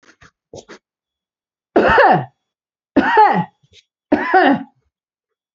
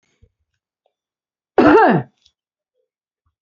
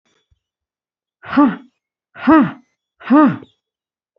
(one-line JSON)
{"three_cough_length": "5.5 s", "three_cough_amplitude": 31874, "three_cough_signal_mean_std_ratio": 0.42, "cough_length": "3.4 s", "cough_amplitude": 30822, "cough_signal_mean_std_ratio": 0.29, "exhalation_length": "4.2 s", "exhalation_amplitude": 26840, "exhalation_signal_mean_std_ratio": 0.36, "survey_phase": "beta (2021-08-13 to 2022-03-07)", "age": "45-64", "gender": "Female", "wearing_mask": "No", "symptom_none": true, "smoker_status": "Never smoked", "respiratory_condition_asthma": false, "respiratory_condition_other": false, "recruitment_source": "REACT", "submission_delay": "1 day", "covid_test_result": "Negative", "covid_test_method": "RT-qPCR"}